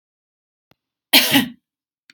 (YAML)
cough_length: 2.1 s
cough_amplitude: 32768
cough_signal_mean_std_ratio: 0.29
survey_phase: beta (2021-08-13 to 2022-03-07)
age: 45-64
gender: Female
wearing_mask: 'No'
symptom_none: true
smoker_status: Ex-smoker
respiratory_condition_asthma: false
respiratory_condition_other: false
recruitment_source: REACT
submission_delay: 4 days
covid_test_result: Negative
covid_test_method: RT-qPCR
influenza_a_test_result: Negative
influenza_b_test_result: Negative